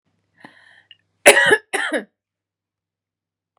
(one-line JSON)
{"cough_length": "3.6 s", "cough_amplitude": 32768, "cough_signal_mean_std_ratio": 0.27, "survey_phase": "beta (2021-08-13 to 2022-03-07)", "age": "45-64", "gender": "Female", "wearing_mask": "No", "symptom_runny_or_blocked_nose": true, "symptom_onset": "13 days", "smoker_status": "Never smoked", "respiratory_condition_asthma": false, "respiratory_condition_other": false, "recruitment_source": "REACT", "submission_delay": "6 days", "covid_test_result": "Negative", "covid_test_method": "RT-qPCR", "influenza_a_test_result": "Negative", "influenza_b_test_result": "Negative"}